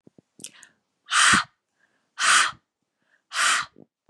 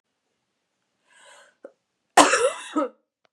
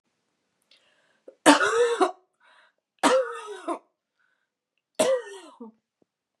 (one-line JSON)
{"exhalation_length": "4.1 s", "exhalation_amplitude": 18791, "exhalation_signal_mean_std_ratio": 0.39, "cough_length": "3.3 s", "cough_amplitude": 32767, "cough_signal_mean_std_ratio": 0.28, "three_cough_length": "6.4 s", "three_cough_amplitude": 29801, "three_cough_signal_mean_std_ratio": 0.35, "survey_phase": "beta (2021-08-13 to 2022-03-07)", "age": "45-64", "gender": "Female", "wearing_mask": "No", "symptom_cough_any": true, "symptom_runny_or_blocked_nose": true, "symptom_sore_throat": true, "symptom_fatigue": true, "symptom_headache": true, "symptom_other": true, "symptom_onset": "3 days", "smoker_status": "Never smoked", "respiratory_condition_asthma": false, "respiratory_condition_other": false, "recruitment_source": "Test and Trace", "submission_delay": "2 days", "covid_test_result": "Positive", "covid_test_method": "RT-qPCR", "covid_ct_value": 27.3, "covid_ct_gene": "ORF1ab gene", "covid_ct_mean": 27.4, "covid_viral_load": "1000 copies/ml", "covid_viral_load_category": "Minimal viral load (< 10K copies/ml)"}